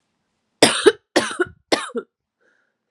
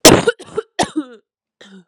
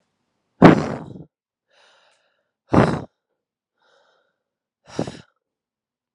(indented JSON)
{
  "three_cough_length": "2.9 s",
  "three_cough_amplitude": 32768,
  "three_cough_signal_mean_std_ratio": 0.31,
  "cough_length": "1.9 s",
  "cough_amplitude": 32768,
  "cough_signal_mean_std_ratio": 0.34,
  "exhalation_length": "6.1 s",
  "exhalation_amplitude": 32768,
  "exhalation_signal_mean_std_ratio": 0.21,
  "survey_phase": "alpha (2021-03-01 to 2021-08-12)",
  "age": "18-44",
  "gender": "Female",
  "wearing_mask": "No",
  "symptom_new_continuous_cough": true,
  "symptom_shortness_of_breath": true,
  "symptom_fatigue": true,
  "symptom_fever_high_temperature": true,
  "symptom_headache": true,
  "symptom_change_to_sense_of_smell_or_taste": true,
  "symptom_onset": "3 days",
  "smoker_status": "Never smoked",
  "respiratory_condition_asthma": false,
  "respiratory_condition_other": false,
  "recruitment_source": "Test and Trace",
  "submission_delay": "2 days",
  "covid_test_result": "Positive",
  "covid_test_method": "RT-qPCR",
  "covid_ct_value": 19.8,
  "covid_ct_gene": "ORF1ab gene",
  "covid_ct_mean": 20.2,
  "covid_viral_load": "240000 copies/ml",
  "covid_viral_load_category": "Low viral load (10K-1M copies/ml)"
}